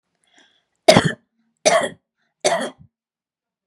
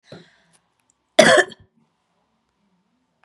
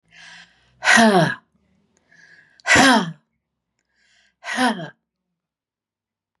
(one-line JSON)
{"three_cough_length": "3.7 s", "three_cough_amplitude": 32768, "three_cough_signal_mean_std_ratio": 0.3, "cough_length": "3.2 s", "cough_amplitude": 32768, "cough_signal_mean_std_ratio": 0.22, "exhalation_length": "6.4 s", "exhalation_amplitude": 32068, "exhalation_signal_mean_std_ratio": 0.35, "survey_phase": "beta (2021-08-13 to 2022-03-07)", "age": "45-64", "gender": "Female", "wearing_mask": "No", "symptom_none": true, "smoker_status": "Never smoked", "respiratory_condition_asthma": false, "respiratory_condition_other": false, "recruitment_source": "REACT", "submission_delay": "1 day", "covid_test_result": "Negative", "covid_test_method": "RT-qPCR", "influenza_a_test_result": "Negative", "influenza_b_test_result": "Negative"}